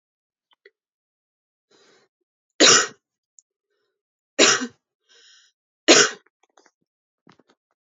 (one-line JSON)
{"three_cough_length": "7.9 s", "three_cough_amplitude": 30525, "three_cough_signal_mean_std_ratio": 0.23, "survey_phase": "beta (2021-08-13 to 2022-03-07)", "age": "18-44", "gender": "Female", "wearing_mask": "No", "symptom_none": true, "symptom_onset": "5 days", "smoker_status": "Never smoked", "respiratory_condition_asthma": false, "respiratory_condition_other": false, "recruitment_source": "Test and Trace", "submission_delay": "3 days", "covid_test_result": "Positive", "covid_test_method": "RT-qPCR", "covid_ct_value": 30.4, "covid_ct_gene": "N gene"}